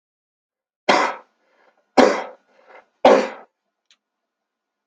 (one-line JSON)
{"three_cough_length": "4.9 s", "three_cough_amplitude": 32768, "three_cough_signal_mean_std_ratio": 0.28, "survey_phase": "beta (2021-08-13 to 2022-03-07)", "age": "65+", "gender": "Male", "wearing_mask": "No", "symptom_none": true, "smoker_status": "Never smoked", "respiratory_condition_asthma": false, "respiratory_condition_other": false, "recruitment_source": "REACT", "submission_delay": "3 days", "covid_test_result": "Negative", "covid_test_method": "RT-qPCR", "influenza_a_test_result": "Negative", "influenza_b_test_result": "Negative"}